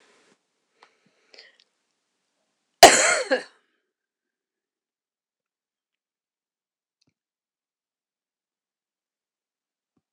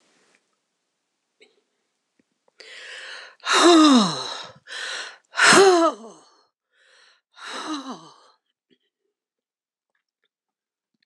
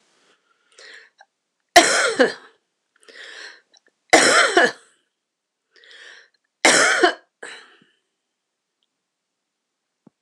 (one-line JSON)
{"cough_length": "10.1 s", "cough_amplitude": 26028, "cough_signal_mean_std_ratio": 0.14, "exhalation_length": "11.1 s", "exhalation_amplitude": 26028, "exhalation_signal_mean_std_ratio": 0.32, "three_cough_length": "10.2 s", "three_cough_amplitude": 26028, "three_cough_signal_mean_std_ratio": 0.31, "survey_phase": "beta (2021-08-13 to 2022-03-07)", "age": "65+", "gender": "Female", "wearing_mask": "No", "symptom_headache": true, "symptom_onset": "12 days", "smoker_status": "Ex-smoker", "respiratory_condition_asthma": false, "respiratory_condition_other": false, "recruitment_source": "REACT", "submission_delay": "0 days", "covid_test_result": "Negative", "covid_test_method": "RT-qPCR"}